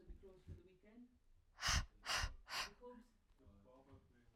{"exhalation_length": "4.4 s", "exhalation_amplitude": 1732, "exhalation_signal_mean_std_ratio": 0.42, "survey_phase": "alpha (2021-03-01 to 2021-08-12)", "age": "18-44", "gender": "Female", "wearing_mask": "No", "symptom_cough_any": true, "symptom_fatigue": true, "symptom_headache": true, "symptom_change_to_sense_of_smell_or_taste": true, "smoker_status": "Never smoked", "respiratory_condition_asthma": false, "respiratory_condition_other": false, "recruitment_source": "Test and Trace", "submission_delay": "2 days", "covid_test_result": "Positive", "covid_test_method": "RT-qPCR"}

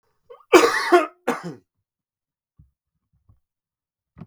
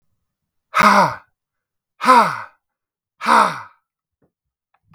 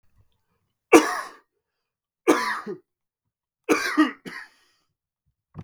{"cough_length": "4.3 s", "cough_amplitude": 32768, "cough_signal_mean_std_ratio": 0.27, "exhalation_length": "4.9 s", "exhalation_amplitude": 32767, "exhalation_signal_mean_std_ratio": 0.36, "three_cough_length": "5.6 s", "three_cough_amplitude": 32766, "three_cough_signal_mean_std_ratio": 0.29, "survey_phase": "beta (2021-08-13 to 2022-03-07)", "age": "18-44", "gender": "Male", "wearing_mask": "No", "symptom_runny_or_blocked_nose": true, "symptom_fatigue": true, "symptom_headache": true, "symptom_change_to_sense_of_smell_or_taste": true, "symptom_onset": "3 days", "smoker_status": "Ex-smoker", "respiratory_condition_asthma": false, "respiratory_condition_other": false, "recruitment_source": "Test and Trace", "submission_delay": "1 day", "covid_test_result": "Positive", "covid_test_method": "RT-qPCR", "covid_ct_value": 13.4, "covid_ct_gene": "ORF1ab gene", "covid_ct_mean": 13.8, "covid_viral_load": "29000000 copies/ml", "covid_viral_load_category": "High viral load (>1M copies/ml)"}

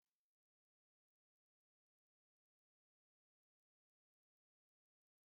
{"cough_length": "5.3 s", "cough_amplitude": 2, "cough_signal_mean_std_ratio": 0.06, "survey_phase": "beta (2021-08-13 to 2022-03-07)", "age": "45-64", "gender": "Male", "wearing_mask": "No", "symptom_none": true, "smoker_status": "Never smoked", "respiratory_condition_asthma": false, "respiratory_condition_other": false, "recruitment_source": "REACT", "submission_delay": "0 days", "covid_test_result": "Negative", "covid_test_method": "RT-qPCR", "influenza_a_test_result": "Negative", "influenza_b_test_result": "Negative"}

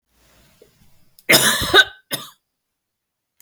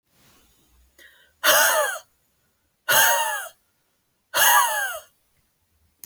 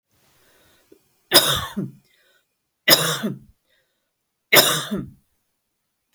{"cough_length": "3.4 s", "cough_amplitude": 32192, "cough_signal_mean_std_ratio": 0.31, "exhalation_length": "6.1 s", "exhalation_amplitude": 21942, "exhalation_signal_mean_std_ratio": 0.43, "three_cough_length": "6.1 s", "three_cough_amplitude": 32768, "three_cough_signal_mean_std_ratio": 0.32, "survey_phase": "beta (2021-08-13 to 2022-03-07)", "age": "65+", "gender": "Female", "wearing_mask": "No", "symptom_none": true, "smoker_status": "Never smoked", "respiratory_condition_asthma": false, "respiratory_condition_other": false, "recruitment_source": "REACT", "submission_delay": "1 day", "covid_test_result": "Negative", "covid_test_method": "RT-qPCR"}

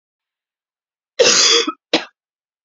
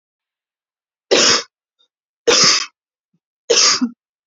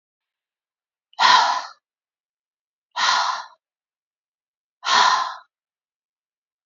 {"cough_length": "2.6 s", "cough_amplitude": 32674, "cough_signal_mean_std_ratio": 0.38, "three_cough_length": "4.3 s", "three_cough_amplitude": 32768, "three_cough_signal_mean_std_ratio": 0.41, "exhalation_length": "6.7 s", "exhalation_amplitude": 26207, "exhalation_signal_mean_std_ratio": 0.35, "survey_phase": "beta (2021-08-13 to 2022-03-07)", "age": "18-44", "gender": "Female", "wearing_mask": "No", "symptom_cough_any": true, "symptom_runny_or_blocked_nose": true, "symptom_shortness_of_breath": true, "symptom_sore_throat": true, "symptom_fatigue": true, "symptom_headache": true, "smoker_status": "Current smoker (e-cigarettes or vapes only)", "respiratory_condition_asthma": false, "respiratory_condition_other": false, "recruitment_source": "Test and Trace", "submission_delay": "2 days", "covid_test_result": "Positive", "covid_test_method": "ePCR"}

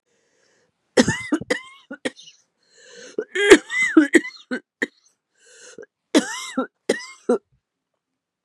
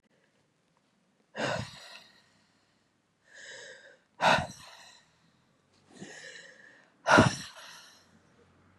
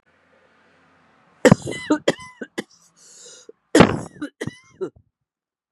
{"three_cough_length": "8.4 s", "three_cough_amplitude": 32768, "three_cough_signal_mean_std_ratio": 0.31, "exhalation_length": "8.8 s", "exhalation_amplitude": 14358, "exhalation_signal_mean_std_ratio": 0.26, "cough_length": "5.7 s", "cough_amplitude": 32768, "cough_signal_mean_std_ratio": 0.25, "survey_phase": "beta (2021-08-13 to 2022-03-07)", "age": "45-64", "gender": "Female", "wearing_mask": "No", "symptom_cough_any": true, "symptom_shortness_of_breath": true, "symptom_sore_throat": true, "symptom_fatigue": true, "symptom_headache": true, "symptom_loss_of_taste": true, "symptom_other": true, "symptom_onset": "5 days", "smoker_status": "Never smoked", "respiratory_condition_asthma": false, "respiratory_condition_other": false, "recruitment_source": "Test and Trace", "submission_delay": "-1 day", "covid_test_result": "Positive", "covid_test_method": "RT-qPCR", "covid_ct_value": 24.1, "covid_ct_gene": "N gene"}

